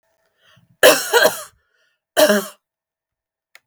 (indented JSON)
{
  "cough_length": "3.7 s",
  "cough_amplitude": 32768,
  "cough_signal_mean_std_ratio": 0.34,
  "survey_phase": "beta (2021-08-13 to 2022-03-07)",
  "age": "18-44",
  "gender": "Female",
  "wearing_mask": "No",
  "symptom_none": true,
  "symptom_onset": "6 days",
  "smoker_status": "Never smoked",
  "respiratory_condition_asthma": false,
  "respiratory_condition_other": false,
  "recruitment_source": "REACT",
  "submission_delay": "6 days",
  "covid_test_result": "Positive",
  "covid_test_method": "RT-qPCR",
  "covid_ct_value": 22.0,
  "covid_ct_gene": "E gene",
  "influenza_a_test_result": "Negative",
  "influenza_b_test_result": "Negative"
}